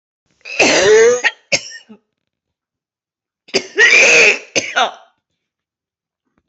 cough_length: 6.5 s
cough_amplitude: 31785
cough_signal_mean_std_ratio: 0.45
survey_phase: alpha (2021-03-01 to 2021-08-12)
age: 45-64
gender: Female
wearing_mask: 'No'
symptom_cough_any: true
symptom_new_continuous_cough: true
symptom_shortness_of_breath: true
symptom_abdominal_pain: true
symptom_fatigue: true
symptom_fever_high_temperature: true
symptom_headache: true
symptom_onset: 3 days
smoker_status: Never smoked
respiratory_condition_asthma: false
respiratory_condition_other: false
recruitment_source: Test and Trace
submission_delay: 2 days
covid_test_result: Positive
covid_test_method: RT-qPCR
covid_ct_value: 24.8
covid_ct_gene: ORF1ab gene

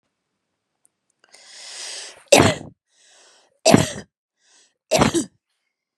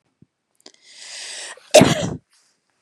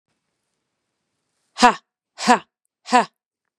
three_cough_length: 6.0 s
three_cough_amplitude: 32768
three_cough_signal_mean_std_ratio: 0.28
cough_length: 2.8 s
cough_amplitude: 32768
cough_signal_mean_std_ratio: 0.27
exhalation_length: 3.6 s
exhalation_amplitude: 32767
exhalation_signal_mean_std_ratio: 0.24
survey_phase: beta (2021-08-13 to 2022-03-07)
age: 45-64
gender: Female
wearing_mask: 'No'
symptom_none: true
smoker_status: Never smoked
respiratory_condition_asthma: false
respiratory_condition_other: false
recruitment_source: REACT
submission_delay: 2 days
covid_test_result: Negative
covid_test_method: RT-qPCR
influenza_a_test_result: Negative
influenza_b_test_result: Negative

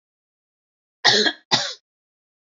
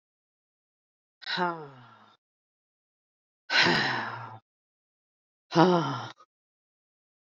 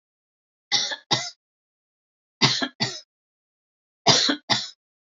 cough_length: 2.5 s
cough_amplitude: 32348
cough_signal_mean_std_ratio: 0.32
exhalation_length: 7.3 s
exhalation_amplitude: 14809
exhalation_signal_mean_std_ratio: 0.33
three_cough_length: 5.1 s
three_cough_amplitude: 26808
three_cough_signal_mean_std_ratio: 0.36
survey_phase: beta (2021-08-13 to 2022-03-07)
age: 18-44
gender: Female
wearing_mask: 'No'
symptom_none: true
smoker_status: Never smoked
respiratory_condition_asthma: false
respiratory_condition_other: false
recruitment_source: REACT
submission_delay: 2 days
covid_test_result: Negative
covid_test_method: RT-qPCR
influenza_a_test_result: Unknown/Void
influenza_b_test_result: Unknown/Void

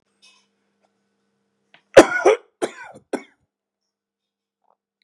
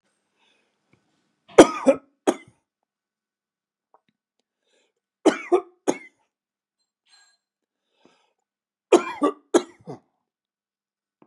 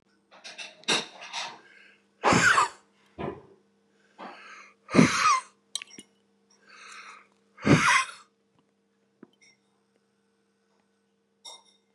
cough_length: 5.0 s
cough_amplitude: 32768
cough_signal_mean_std_ratio: 0.18
three_cough_length: 11.3 s
three_cough_amplitude: 32768
three_cough_signal_mean_std_ratio: 0.19
exhalation_length: 11.9 s
exhalation_amplitude: 22781
exhalation_signal_mean_std_ratio: 0.32
survey_phase: beta (2021-08-13 to 2022-03-07)
age: 65+
gender: Male
wearing_mask: 'No'
symptom_runny_or_blocked_nose: true
symptom_shortness_of_breath: true
symptom_fatigue: true
symptom_onset: 12 days
smoker_status: Never smoked
respiratory_condition_asthma: false
respiratory_condition_other: false
recruitment_source: REACT
submission_delay: 2 days
covid_test_result: Negative
covid_test_method: RT-qPCR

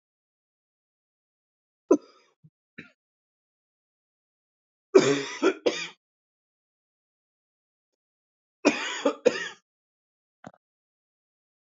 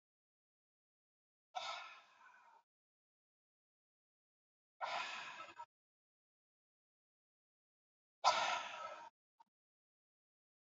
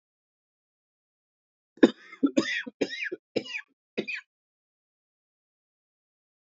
three_cough_length: 11.7 s
three_cough_amplitude: 21597
three_cough_signal_mean_std_ratio: 0.22
exhalation_length: 10.7 s
exhalation_amplitude: 4415
exhalation_signal_mean_std_ratio: 0.26
cough_length: 6.5 s
cough_amplitude: 20846
cough_signal_mean_std_ratio: 0.22
survey_phase: beta (2021-08-13 to 2022-03-07)
age: 18-44
gender: Male
wearing_mask: 'No'
symptom_cough_any: true
symptom_runny_or_blocked_nose: true
symptom_sore_throat: true
symptom_fatigue: true
symptom_onset: 8 days
smoker_status: Never smoked
respiratory_condition_asthma: false
respiratory_condition_other: false
recruitment_source: Test and Trace
submission_delay: 1 day
covid_test_result: Negative
covid_test_method: RT-qPCR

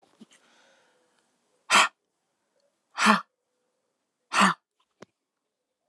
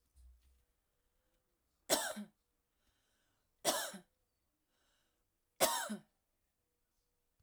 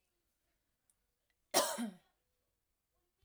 exhalation_length: 5.9 s
exhalation_amplitude: 21728
exhalation_signal_mean_std_ratio: 0.24
three_cough_length: 7.4 s
three_cough_amplitude: 5371
three_cough_signal_mean_std_ratio: 0.26
cough_length: 3.2 s
cough_amplitude: 5604
cough_signal_mean_std_ratio: 0.24
survey_phase: alpha (2021-03-01 to 2021-08-12)
age: 18-44
gender: Female
wearing_mask: 'No'
symptom_fatigue: true
symptom_onset: 12 days
smoker_status: Never smoked
respiratory_condition_asthma: false
respiratory_condition_other: false
recruitment_source: REACT
submission_delay: 1 day
covid_test_result: Negative
covid_test_method: RT-qPCR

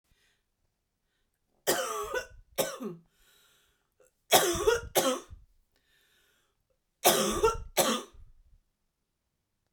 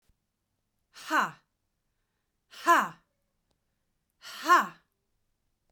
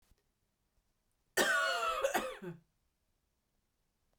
three_cough_length: 9.7 s
three_cough_amplitude: 16428
three_cough_signal_mean_std_ratio: 0.37
exhalation_length: 5.7 s
exhalation_amplitude: 11429
exhalation_signal_mean_std_ratio: 0.26
cough_length: 4.2 s
cough_amplitude: 4676
cough_signal_mean_std_ratio: 0.41
survey_phase: beta (2021-08-13 to 2022-03-07)
age: 45-64
gender: Female
wearing_mask: 'No'
symptom_change_to_sense_of_smell_or_taste: true
symptom_onset: 9 days
smoker_status: Ex-smoker
respiratory_condition_asthma: false
respiratory_condition_other: false
recruitment_source: REACT
submission_delay: 0 days
covid_test_result: Negative
covid_test_method: RT-qPCR
influenza_a_test_result: Unknown/Void
influenza_b_test_result: Unknown/Void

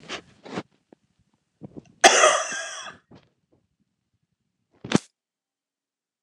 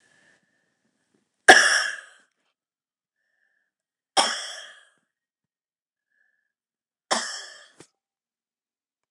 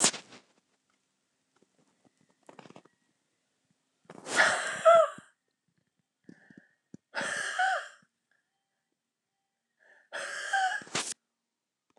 cough_length: 6.2 s
cough_amplitude: 29204
cough_signal_mean_std_ratio: 0.24
three_cough_length: 9.1 s
three_cough_amplitude: 29204
three_cough_signal_mean_std_ratio: 0.2
exhalation_length: 12.0 s
exhalation_amplitude: 15930
exhalation_signal_mean_std_ratio: 0.3
survey_phase: alpha (2021-03-01 to 2021-08-12)
age: 65+
gender: Female
wearing_mask: 'No'
symptom_none: true
smoker_status: Never smoked
respiratory_condition_asthma: true
respiratory_condition_other: false
recruitment_source: REACT
submission_delay: 2 days
covid_test_result: Negative
covid_test_method: RT-qPCR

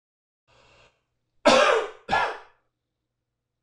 cough_length: 3.6 s
cough_amplitude: 21688
cough_signal_mean_std_ratio: 0.33
survey_phase: alpha (2021-03-01 to 2021-08-12)
age: 45-64
gender: Male
wearing_mask: 'No'
symptom_none: true
smoker_status: Ex-smoker
respiratory_condition_asthma: false
respiratory_condition_other: false
recruitment_source: REACT
submission_delay: 2 days
covid_test_result: Negative
covid_test_method: RT-qPCR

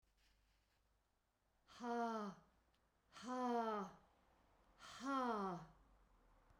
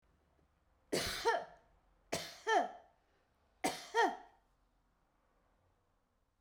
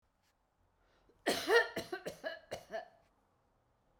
exhalation_length: 6.6 s
exhalation_amplitude: 897
exhalation_signal_mean_std_ratio: 0.48
three_cough_length: 6.4 s
three_cough_amplitude: 3559
three_cough_signal_mean_std_ratio: 0.34
cough_length: 4.0 s
cough_amplitude: 5829
cough_signal_mean_std_ratio: 0.32
survey_phase: beta (2021-08-13 to 2022-03-07)
age: 65+
gender: Female
wearing_mask: 'No'
symptom_none: true
smoker_status: Never smoked
respiratory_condition_asthma: false
respiratory_condition_other: false
recruitment_source: REACT
submission_delay: 1 day
covid_test_result: Negative
covid_test_method: RT-qPCR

